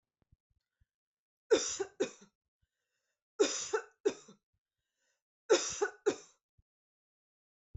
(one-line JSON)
{"three_cough_length": "7.8 s", "three_cough_amplitude": 6051, "three_cough_signal_mean_std_ratio": 0.28, "survey_phase": "beta (2021-08-13 to 2022-03-07)", "age": "18-44", "gender": "Female", "wearing_mask": "No", "symptom_none": true, "smoker_status": "Never smoked", "respiratory_condition_asthma": false, "respiratory_condition_other": false, "recruitment_source": "REACT", "submission_delay": "2 days", "covid_test_result": "Negative", "covid_test_method": "RT-qPCR", "influenza_a_test_result": "Negative", "influenza_b_test_result": "Negative"}